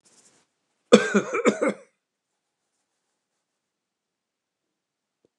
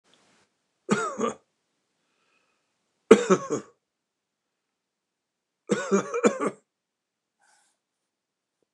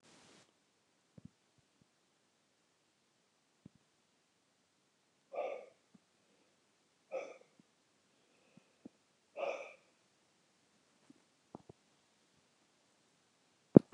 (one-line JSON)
{"cough_length": "5.4 s", "cough_amplitude": 29204, "cough_signal_mean_std_ratio": 0.22, "three_cough_length": "8.7 s", "three_cough_amplitude": 29204, "three_cough_signal_mean_std_ratio": 0.25, "exhalation_length": "13.9 s", "exhalation_amplitude": 24671, "exhalation_signal_mean_std_ratio": 0.09, "survey_phase": "beta (2021-08-13 to 2022-03-07)", "age": "65+", "gender": "Male", "wearing_mask": "No", "symptom_fatigue": true, "symptom_onset": "12 days", "smoker_status": "Ex-smoker", "respiratory_condition_asthma": false, "respiratory_condition_other": false, "recruitment_source": "REACT", "submission_delay": "34 days", "covid_test_result": "Negative", "covid_test_method": "RT-qPCR", "influenza_a_test_result": "Negative", "influenza_b_test_result": "Negative"}